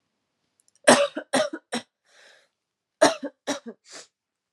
{"cough_length": "4.5 s", "cough_amplitude": 29881, "cough_signal_mean_std_ratio": 0.28, "survey_phase": "alpha (2021-03-01 to 2021-08-12)", "age": "18-44", "gender": "Female", "wearing_mask": "No", "symptom_cough_any": true, "symptom_new_continuous_cough": true, "symptom_headache": true, "smoker_status": "Never smoked", "respiratory_condition_asthma": false, "respiratory_condition_other": false, "recruitment_source": "Test and Trace", "submission_delay": "2 days", "covid_test_result": "Positive", "covid_test_method": "LFT"}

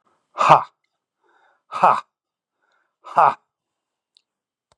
{"exhalation_length": "4.8 s", "exhalation_amplitude": 32768, "exhalation_signal_mean_std_ratio": 0.25, "survey_phase": "beta (2021-08-13 to 2022-03-07)", "age": "45-64", "gender": "Male", "wearing_mask": "No", "symptom_none": true, "smoker_status": "Never smoked", "respiratory_condition_asthma": false, "respiratory_condition_other": false, "recruitment_source": "REACT", "submission_delay": "2 days", "covid_test_result": "Negative", "covid_test_method": "RT-qPCR", "influenza_a_test_result": "Negative", "influenza_b_test_result": "Negative"}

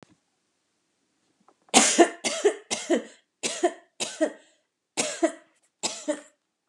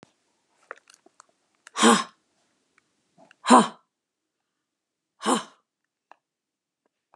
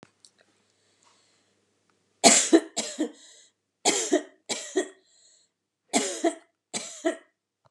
{"cough_length": "6.7 s", "cough_amplitude": 31693, "cough_signal_mean_std_ratio": 0.36, "exhalation_length": "7.2 s", "exhalation_amplitude": 28549, "exhalation_signal_mean_std_ratio": 0.21, "three_cough_length": "7.7 s", "three_cough_amplitude": 29283, "three_cough_signal_mean_std_ratio": 0.32, "survey_phase": "beta (2021-08-13 to 2022-03-07)", "age": "65+", "gender": "Female", "wearing_mask": "No", "symptom_none": true, "smoker_status": "Ex-smoker", "respiratory_condition_asthma": false, "respiratory_condition_other": false, "recruitment_source": "REACT", "submission_delay": "2 days", "covid_test_result": "Negative", "covid_test_method": "RT-qPCR", "influenza_a_test_result": "Negative", "influenza_b_test_result": "Negative"}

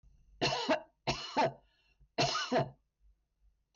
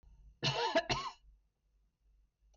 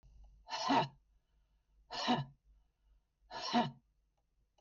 {"three_cough_length": "3.8 s", "three_cough_amplitude": 2783, "three_cough_signal_mean_std_ratio": 0.48, "cough_length": "2.6 s", "cough_amplitude": 2646, "cough_signal_mean_std_ratio": 0.41, "exhalation_length": "4.6 s", "exhalation_amplitude": 2344, "exhalation_signal_mean_std_ratio": 0.38, "survey_phase": "beta (2021-08-13 to 2022-03-07)", "age": "65+", "gender": "Female", "wearing_mask": "No", "symptom_none": true, "smoker_status": "Never smoked", "respiratory_condition_asthma": false, "respiratory_condition_other": false, "recruitment_source": "REACT", "submission_delay": "2 days", "covid_test_result": "Negative", "covid_test_method": "RT-qPCR", "influenza_a_test_result": "Unknown/Void", "influenza_b_test_result": "Unknown/Void"}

